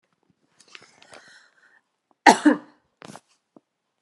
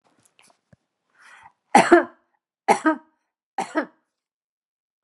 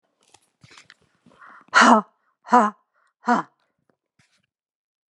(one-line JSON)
{"cough_length": "4.0 s", "cough_amplitude": 32768, "cough_signal_mean_std_ratio": 0.18, "three_cough_length": "5.0 s", "three_cough_amplitude": 32759, "three_cough_signal_mean_std_ratio": 0.24, "exhalation_length": "5.1 s", "exhalation_amplitude": 29503, "exhalation_signal_mean_std_ratio": 0.26, "survey_phase": "beta (2021-08-13 to 2022-03-07)", "age": "65+", "gender": "Female", "wearing_mask": "No", "symptom_none": true, "smoker_status": "Never smoked", "respiratory_condition_asthma": false, "respiratory_condition_other": false, "recruitment_source": "REACT", "submission_delay": "1 day", "covid_test_result": "Negative", "covid_test_method": "RT-qPCR"}